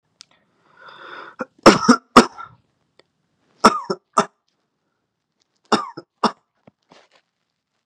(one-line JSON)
{"three_cough_length": "7.9 s", "three_cough_amplitude": 32768, "three_cough_signal_mean_std_ratio": 0.22, "survey_phase": "beta (2021-08-13 to 2022-03-07)", "age": "18-44", "gender": "Male", "wearing_mask": "Yes", "symptom_none": true, "smoker_status": "Current smoker (e-cigarettes or vapes only)", "respiratory_condition_asthma": false, "respiratory_condition_other": false, "recruitment_source": "REACT", "submission_delay": "1 day", "covid_test_result": "Negative", "covid_test_method": "RT-qPCR", "influenza_a_test_result": "Negative", "influenza_b_test_result": "Negative"}